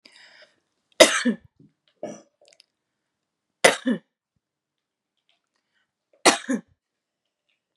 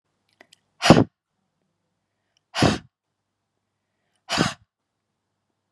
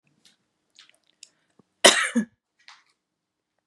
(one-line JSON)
{"three_cough_length": "7.8 s", "three_cough_amplitude": 32768, "three_cough_signal_mean_std_ratio": 0.21, "exhalation_length": "5.7 s", "exhalation_amplitude": 32768, "exhalation_signal_mean_std_ratio": 0.22, "cough_length": "3.7 s", "cough_amplitude": 32177, "cough_signal_mean_std_ratio": 0.2, "survey_phase": "beta (2021-08-13 to 2022-03-07)", "age": "45-64", "gender": "Female", "wearing_mask": "No", "symptom_cough_any": true, "symptom_runny_or_blocked_nose": true, "symptom_sore_throat": true, "symptom_fatigue": true, "smoker_status": "Never smoked", "respiratory_condition_asthma": false, "respiratory_condition_other": false, "recruitment_source": "Test and Trace", "submission_delay": "2 days", "covid_test_result": "Positive", "covid_test_method": "RT-qPCR", "covid_ct_value": 19.4, "covid_ct_gene": "ORF1ab gene"}